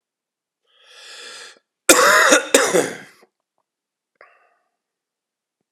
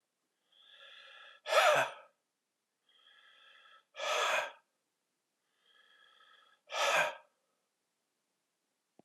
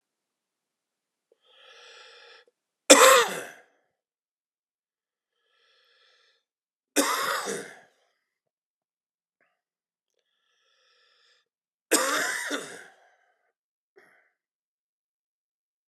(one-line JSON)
{"cough_length": "5.7 s", "cough_amplitude": 32768, "cough_signal_mean_std_ratio": 0.32, "exhalation_length": "9.0 s", "exhalation_amplitude": 6076, "exhalation_signal_mean_std_ratio": 0.31, "three_cough_length": "15.9 s", "three_cough_amplitude": 32767, "three_cough_signal_mean_std_ratio": 0.21, "survey_phase": "beta (2021-08-13 to 2022-03-07)", "age": "45-64", "gender": "Male", "wearing_mask": "No", "symptom_cough_any": true, "symptom_new_continuous_cough": true, "symptom_runny_or_blocked_nose": true, "symptom_shortness_of_breath": true, "symptom_sore_throat": true, "symptom_abdominal_pain": true, "symptom_fatigue": true, "symptom_fever_high_temperature": true, "symptom_headache": true, "symptom_change_to_sense_of_smell_or_taste": true, "symptom_loss_of_taste": true, "symptom_onset": "5 days", "smoker_status": "Never smoked", "respiratory_condition_asthma": false, "respiratory_condition_other": false, "recruitment_source": "Test and Trace", "submission_delay": "2 days", "covid_test_result": "Positive", "covid_test_method": "LAMP"}